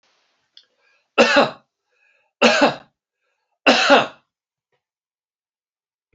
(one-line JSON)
{"three_cough_length": "6.1 s", "three_cough_amplitude": 29910, "three_cough_signal_mean_std_ratio": 0.31, "survey_phase": "beta (2021-08-13 to 2022-03-07)", "age": "65+", "gender": "Male", "wearing_mask": "No", "symptom_none": true, "smoker_status": "Never smoked", "respiratory_condition_asthma": false, "respiratory_condition_other": false, "recruitment_source": "REACT", "submission_delay": "3 days", "covid_test_result": "Negative", "covid_test_method": "RT-qPCR", "influenza_a_test_result": "Negative", "influenza_b_test_result": "Negative"}